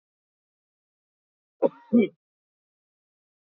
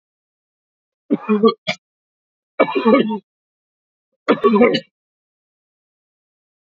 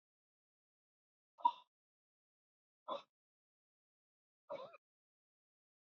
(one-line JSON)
{"cough_length": "3.5 s", "cough_amplitude": 11453, "cough_signal_mean_std_ratio": 0.19, "three_cough_length": "6.7 s", "three_cough_amplitude": 30134, "three_cough_signal_mean_std_ratio": 0.34, "exhalation_length": "6.0 s", "exhalation_amplitude": 2979, "exhalation_signal_mean_std_ratio": 0.14, "survey_phase": "beta (2021-08-13 to 2022-03-07)", "age": "65+", "gender": "Male", "wearing_mask": "No", "symptom_cough_any": true, "symptom_new_continuous_cough": true, "symptom_runny_or_blocked_nose": true, "symptom_sore_throat": true, "symptom_fatigue": true, "symptom_onset": "10 days", "smoker_status": "Ex-smoker", "respiratory_condition_asthma": false, "respiratory_condition_other": false, "recruitment_source": "REACT", "submission_delay": "2 days", "covid_test_result": "Negative", "covid_test_method": "RT-qPCR", "influenza_a_test_result": "Unknown/Void", "influenza_b_test_result": "Unknown/Void"}